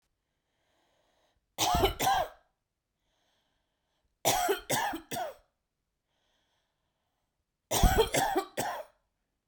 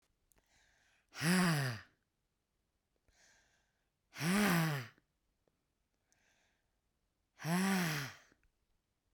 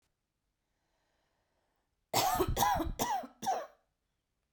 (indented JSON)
{
  "three_cough_length": "9.5 s",
  "three_cough_amplitude": 9863,
  "three_cough_signal_mean_std_ratio": 0.39,
  "exhalation_length": "9.1 s",
  "exhalation_amplitude": 3738,
  "exhalation_signal_mean_std_ratio": 0.39,
  "cough_length": "4.5 s",
  "cough_amplitude": 5000,
  "cough_signal_mean_std_ratio": 0.44,
  "survey_phase": "beta (2021-08-13 to 2022-03-07)",
  "age": "45-64",
  "gender": "Female",
  "wearing_mask": "No",
  "symptom_other": true,
  "smoker_status": "Current smoker (e-cigarettes or vapes only)",
  "respiratory_condition_asthma": false,
  "respiratory_condition_other": false,
  "recruitment_source": "REACT",
  "submission_delay": "1 day",
  "covid_test_result": "Negative",
  "covid_test_method": "RT-qPCR"
}